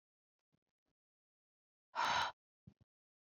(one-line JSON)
{"exhalation_length": "3.3 s", "exhalation_amplitude": 2174, "exhalation_signal_mean_std_ratio": 0.26, "survey_phase": "beta (2021-08-13 to 2022-03-07)", "age": "18-44", "gender": "Female", "wearing_mask": "No", "symptom_runny_or_blocked_nose": true, "symptom_sore_throat": true, "symptom_fatigue": true, "symptom_onset": "9 days", "smoker_status": "Ex-smoker", "respiratory_condition_asthma": false, "respiratory_condition_other": false, "recruitment_source": "REACT", "submission_delay": "2 days", "covid_test_result": "Negative", "covid_test_method": "RT-qPCR", "influenza_a_test_result": "Negative", "influenza_b_test_result": "Negative"}